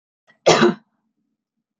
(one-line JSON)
{"cough_length": "1.8 s", "cough_amplitude": 28978, "cough_signal_mean_std_ratio": 0.31, "survey_phase": "beta (2021-08-13 to 2022-03-07)", "age": "45-64", "gender": "Female", "wearing_mask": "No", "symptom_none": true, "smoker_status": "Never smoked", "respiratory_condition_asthma": false, "respiratory_condition_other": false, "recruitment_source": "REACT", "submission_delay": "2 days", "covid_test_result": "Negative", "covid_test_method": "RT-qPCR", "influenza_a_test_result": "Negative", "influenza_b_test_result": "Negative"}